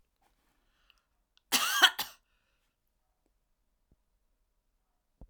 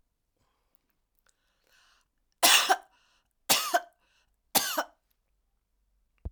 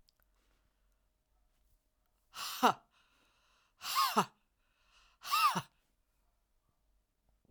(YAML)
cough_length: 5.3 s
cough_amplitude: 18016
cough_signal_mean_std_ratio: 0.2
three_cough_length: 6.3 s
three_cough_amplitude: 17178
three_cough_signal_mean_std_ratio: 0.27
exhalation_length: 7.5 s
exhalation_amplitude: 6917
exhalation_signal_mean_std_ratio: 0.27
survey_phase: beta (2021-08-13 to 2022-03-07)
age: 65+
gender: Female
wearing_mask: 'No'
symptom_runny_or_blocked_nose: true
symptom_headache: true
smoker_status: Never smoked
respiratory_condition_asthma: false
respiratory_condition_other: false
recruitment_source: Test and Trace
submission_delay: 2 days
covid_test_result: Positive
covid_test_method: RT-qPCR